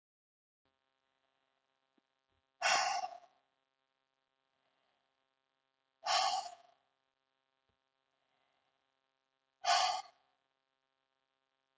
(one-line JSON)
{"exhalation_length": "11.8 s", "exhalation_amplitude": 3758, "exhalation_signal_mean_std_ratio": 0.26, "survey_phase": "beta (2021-08-13 to 2022-03-07)", "age": "18-44", "gender": "Female", "wearing_mask": "No", "symptom_none": true, "smoker_status": "Never smoked", "respiratory_condition_asthma": false, "respiratory_condition_other": false, "recruitment_source": "REACT", "submission_delay": "1 day", "covid_test_result": "Negative", "covid_test_method": "RT-qPCR"}